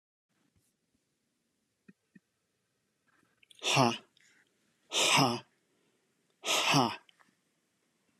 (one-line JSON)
{"exhalation_length": "8.2 s", "exhalation_amplitude": 8293, "exhalation_signal_mean_std_ratio": 0.3, "survey_phase": "beta (2021-08-13 to 2022-03-07)", "age": "45-64", "gender": "Male", "wearing_mask": "No", "symptom_none": true, "smoker_status": "Ex-smoker", "respiratory_condition_asthma": false, "respiratory_condition_other": false, "recruitment_source": "REACT", "submission_delay": "1 day", "covid_test_result": "Negative", "covid_test_method": "RT-qPCR"}